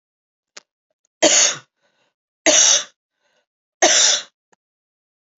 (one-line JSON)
{"three_cough_length": "5.4 s", "three_cough_amplitude": 32453, "three_cough_signal_mean_std_ratio": 0.36, "survey_phase": "beta (2021-08-13 to 2022-03-07)", "age": "45-64", "gender": "Female", "wearing_mask": "No", "symptom_new_continuous_cough": true, "symptom_runny_or_blocked_nose": true, "symptom_sore_throat": true, "symptom_fatigue": true, "symptom_change_to_sense_of_smell_or_taste": true, "symptom_onset": "2 days", "smoker_status": "Never smoked", "respiratory_condition_asthma": false, "respiratory_condition_other": false, "recruitment_source": "Test and Trace", "submission_delay": "1 day", "covid_test_result": "Positive", "covid_test_method": "RT-qPCR", "covid_ct_value": 19.8, "covid_ct_gene": "ORF1ab gene", "covid_ct_mean": 20.4, "covid_viral_load": "210000 copies/ml", "covid_viral_load_category": "Low viral load (10K-1M copies/ml)"}